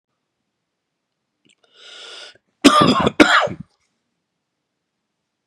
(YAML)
cough_length: 5.5 s
cough_amplitude: 32768
cough_signal_mean_std_ratio: 0.29
survey_phase: beta (2021-08-13 to 2022-03-07)
age: 45-64
gender: Male
wearing_mask: 'No'
symptom_cough_any: true
symptom_runny_or_blocked_nose: true
symptom_fatigue: true
symptom_change_to_sense_of_smell_or_taste: true
symptom_loss_of_taste: true
symptom_onset: 7 days
smoker_status: Never smoked
respiratory_condition_asthma: false
respiratory_condition_other: false
recruitment_source: Test and Trace
submission_delay: 2 days
covid_test_result: Positive
covid_test_method: RT-qPCR
covid_ct_value: 14.8
covid_ct_gene: N gene
covid_ct_mean: 15.0
covid_viral_load: 12000000 copies/ml
covid_viral_load_category: High viral load (>1M copies/ml)